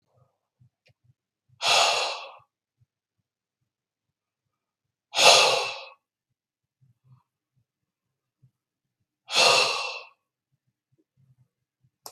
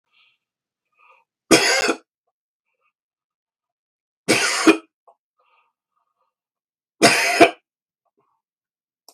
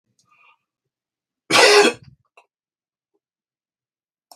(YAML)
exhalation_length: 12.1 s
exhalation_amplitude: 32234
exhalation_signal_mean_std_ratio: 0.28
three_cough_length: 9.1 s
three_cough_amplitude: 32768
three_cough_signal_mean_std_ratio: 0.28
cough_length: 4.4 s
cough_amplitude: 32768
cough_signal_mean_std_ratio: 0.25
survey_phase: beta (2021-08-13 to 2022-03-07)
age: 45-64
gender: Male
wearing_mask: 'No'
symptom_runny_or_blocked_nose: true
symptom_fever_high_temperature: true
symptom_headache: true
symptom_onset: 4 days
smoker_status: Never smoked
respiratory_condition_asthma: false
respiratory_condition_other: true
recruitment_source: Test and Trace
submission_delay: 2 days
covid_test_result: Positive
covid_test_method: RT-qPCR
covid_ct_value: 19.8
covid_ct_gene: ORF1ab gene
covid_ct_mean: 20.2
covid_viral_load: 230000 copies/ml
covid_viral_load_category: Low viral load (10K-1M copies/ml)